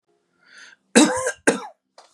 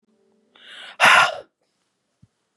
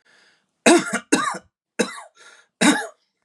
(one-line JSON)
{"cough_length": "2.1 s", "cough_amplitude": 31310, "cough_signal_mean_std_ratio": 0.34, "exhalation_length": "2.6 s", "exhalation_amplitude": 31906, "exhalation_signal_mean_std_ratio": 0.3, "three_cough_length": "3.2 s", "three_cough_amplitude": 28568, "three_cough_signal_mean_std_ratio": 0.38, "survey_phase": "beta (2021-08-13 to 2022-03-07)", "age": "18-44", "gender": "Male", "wearing_mask": "No", "symptom_none": true, "smoker_status": "Never smoked", "respiratory_condition_asthma": false, "respiratory_condition_other": false, "recruitment_source": "REACT", "submission_delay": "1 day", "covid_test_result": "Negative", "covid_test_method": "RT-qPCR", "influenza_a_test_result": "Negative", "influenza_b_test_result": "Negative"}